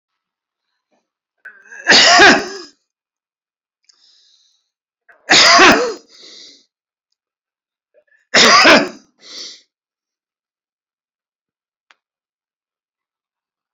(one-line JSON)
{"three_cough_length": "13.7 s", "three_cough_amplitude": 32281, "three_cough_signal_mean_std_ratio": 0.31, "survey_phase": "beta (2021-08-13 to 2022-03-07)", "age": "45-64", "gender": "Male", "wearing_mask": "No", "symptom_none": true, "smoker_status": "Never smoked", "respiratory_condition_asthma": false, "respiratory_condition_other": false, "recruitment_source": "REACT", "submission_delay": "1 day", "covid_test_result": "Negative", "covid_test_method": "RT-qPCR"}